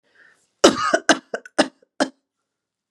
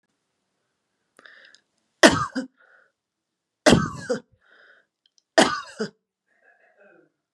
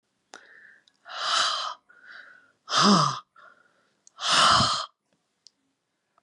{"cough_length": "2.9 s", "cough_amplitude": 32768, "cough_signal_mean_std_ratio": 0.3, "three_cough_length": "7.3 s", "three_cough_amplitude": 32767, "three_cough_signal_mean_std_ratio": 0.24, "exhalation_length": "6.2 s", "exhalation_amplitude": 16741, "exhalation_signal_mean_std_ratio": 0.41, "survey_phase": "beta (2021-08-13 to 2022-03-07)", "age": "65+", "gender": "Female", "wearing_mask": "No", "symptom_none": true, "smoker_status": "Ex-smoker", "respiratory_condition_asthma": false, "respiratory_condition_other": false, "recruitment_source": "REACT", "submission_delay": "2 days", "covid_test_result": "Negative", "covid_test_method": "RT-qPCR", "influenza_a_test_result": "Negative", "influenza_b_test_result": "Negative"}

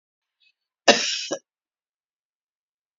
{"cough_length": "3.0 s", "cough_amplitude": 32768, "cough_signal_mean_std_ratio": 0.22, "survey_phase": "beta (2021-08-13 to 2022-03-07)", "age": "65+", "gender": "Female", "wearing_mask": "No", "symptom_cough_any": true, "symptom_runny_or_blocked_nose": true, "symptom_onset": "12 days", "smoker_status": "Ex-smoker", "respiratory_condition_asthma": false, "respiratory_condition_other": true, "recruitment_source": "REACT", "submission_delay": "1 day", "covid_test_result": "Negative", "covid_test_method": "RT-qPCR", "influenza_a_test_result": "Negative", "influenza_b_test_result": "Negative"}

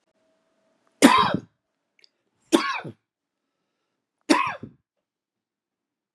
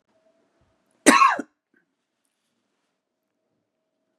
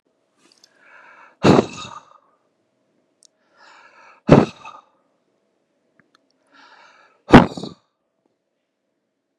{"three_cough_length": "6.1 s", "three_cough_amplitude": 32336, "three_cough_signal_mean_std_ratio": 0.26, "cough_length": "4.2 s", "cough_amplitude": 32767, "cough_signal_mean_std_ratio": 0.21, "exhalation_length": "9.4 s", "exhalation_amplitude": 32768, "exhalation_signal_mean_std_ratio": 0.19, "survey_phase": "beta (2021-08-13 to 2022-03-07)", "age": "45-64", "gender": "Male", "wearing_mask": "No", "symptom_cough_any": true, "smoker_status": "Never smoked", "respiratory_condition_asthma": true, "respiratory_condition_other": false, "recruitment_source": "REACT", "submission_delay": "1 day", "covid_test_result": "Negative", "covid_test_method": "RT-qPCR", "influenza_a_test_result": "Negative", "influenza_b_test_result": "Negative"}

